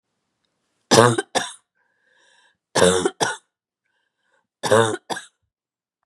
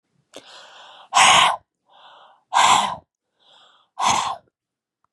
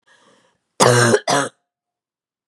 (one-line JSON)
{"three_cough_length": "6.1 s", "three_cough_amplitude": 32768, "three_cough_signal_mean_std_ratio": 0.32, "exhalation_length": "5.1 s", "exhalation_amplitude": 27395, "exhalation_signal_mean_std_ratio": 0.39, "cough_length": "2.5 s", "cough_amplitude": 32768, "cough_signal_mean_std_ratio": 0.39, "survey_phase": "beta (2021-08-13 to 2022-03-07)", "age": "45-64", "gender": "Female", "wearing_mask": "No", "symptom_none": true, "smoker_status": "Never smoked", "respiratory_condition_asthma": false, "respiratory_condition_other": false, "recruitment_source": "REACT", "submission_delay": "2 days", "covid_test_result": "Negative", "covid_test_method": "RT-qPCR", "influenza_a_test_result": "Negative", "influenza_b_test_result": "Negative"}